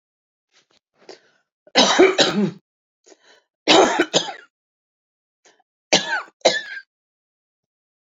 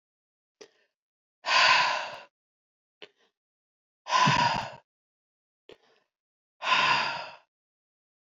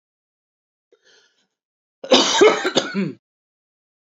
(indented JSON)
{
  "three_cough_length": "8.2 s",
  "three_cough_amplitude": 31858,
  "three_cough_signal_mean_std_ratio": 0.34,
  "exhalation_length": "8.4 s",
  "exhalation_amplitude": 12964,
  "exhalation_signal_mean_std_ratio": 0.37,
  "cough_length": "4.1 s",
  "cough_amplitude": 29906,
  "cough_signal_mean_std_ratio": 0.33,
  "survey_phase": "alpha (2021-03-01 to 2021-08-12)",
  "age": "45-64",
  "gender": "Female",
  "wearing_mask": "No",
  "symptom_none": true,
  "smoker_status": "Current smoker (11 or more cigarettes per day)",
  "respiratory_condition_asthma": false,
  "respiratory_condition_other": false,
  "recruitment_source": "REACT",
  "submission_delay": "2 days",
  "covid_test_result": "Negative",
  "covid_test_method": "RT-qPCR"
}